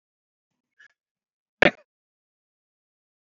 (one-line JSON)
{"cough_length": "3.2 s", "cough_amplitude": 27533, "cough_signal_mean_std_ratio": 0.1, "survey_phase": "beta (2021-08-13 to 2022-03-07)", "age": "65+", "gender": "Male", "wearing_mask": "No", "symptom_none": true, "smoker_status": "Never smoked", "respiratory_condition_asthma": true, "respiratory_condition_other": false, "recruitment_source": "REACT", "submission_delay": "3 days", "covid_test_result": "Negative", "covid_test_method": "RT-qPCR", "influenza_a_test_result": "Negative", "influenza_b_test_result": "Negative"}